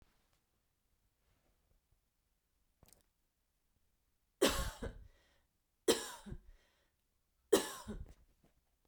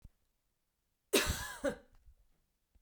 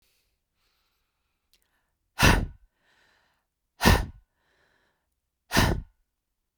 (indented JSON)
{
  "three_cough_length": "8.9 s",
  "three_cough_amplitude": 5423,
  "three_cough_signal_mean_std_ratio": 0.23,
  "cough_length": "2.8 s",
  "cough_amplitude": 7231,
  "cough_signal_mean_std_ratio": 0.31,
  "exhalation_length": "6.6 s",
  "exhalation_amplitude": 21539,
  "exhalation_signal_mean_std_ratio": 0.26,
  "survey_phase": "beta (2021-08-13 to 2022-03-07)",
  "age": "45-64",
  "gender": "Female",
  "wearing_mask": "No",
  "symptom_none": true,
  "smoker_status": "Never smoked",
  "respiratory_condition_asthma": false,
  "respiratory_condition_other": false,
  "recruitment_source": "REACT",
  "submission_delay": "1 day",
  "covid_test_result": "Negative",
  "covid_test_method": "RT-qPCR",
  "influenza_a_test_result": "Negative",
  "influenza_b_test_result": "Negative"
}